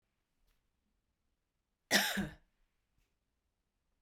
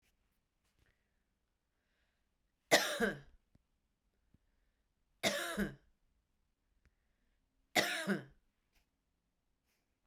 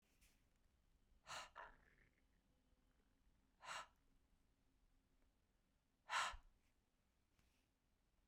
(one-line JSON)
{"cough_length": "4.0 s", "cough_amplitude": 5664, "cough_signal_mean_std_ratio": 0.23, "three_cough_length": "10.1 s", "three_cough_amplitude": 7099, "three_cough_signal_mean_std_ratio": 0.26, "exhalation_length": "8.3 s", "exhalation_amplitude": 932, "exhalation_signal_mean_std_ratio": 0.27, "survey_phase": "beta (2021-08-13 to 2022-03-07)", "age": "45-64", "gender": "Female", "wearing_mask": "No", "symptom_none": true, "smoker_status": "Ex-smoker", "respiratory_condition_asthma": false, "respiratory_condition_other": false, "recruitment_source": "REACT", "submission_delay": "2 days", "covid_test_result": "Negative", "covid_test_method": "RT-qPCR"}